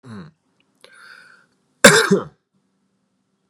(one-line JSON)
{"cough_length": "3.5 s", "cough_amplitude": 32768, "cough_signal_mean_std_ratio": 0.24, "survey_phase": "beta (2021-08-13 to 2022-03-07)", "age": "18-44", "gender": "Male", "wearing_mask": "No", "symptom_none": true, "smoker_status": "Current smoker (11 or more cigarettes per day)", "respiratory_condition_asthma": false, "respiratory_condition_other": false, "recruitment_source": "REACT", "submission_delay": "4 days", "covid_test_result": "Negative", "covid_test_method": "RT-qPCR", "influenza_a_test_result": "Negative", "influenza_b_test_result": "Negative"}